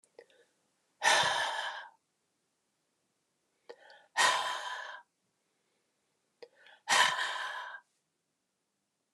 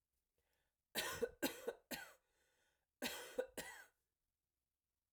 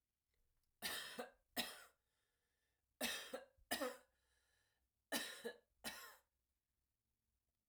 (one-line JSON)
{"exhalation_length": "9.1 s", "exhalation_amplitude": 8743, "exhalation_signal_mean_std_ratio": 0.36, "cough_length": "5.1 s", "cough_amplitude": 1588, "cough_signal_mean_std_ratio": 0.36, "three_cough_length": "7.7 s", "three_cough_amplitude": 1345, "three_cough_signal_mean_std_ratio": 0.38, "survey_phase": "alpha (2021-03-01 to 2021-08-12)", "age": "45-64", "gender": "Female", "wearing_mask": "No", "symptom_fatigue": true, "smoker_status": "Never smoked", "respiratory_condition_asthma": false, "respiratory_condition_other": false, "recruitment_source": "Test and Trace", "submission_delay": "2 days", "covid_test_result": "Positive", "covid_test_method": "RT-qPCR", "covid_ct_value": 26.7, "covid_ct_gene": "ORF1ab gene"}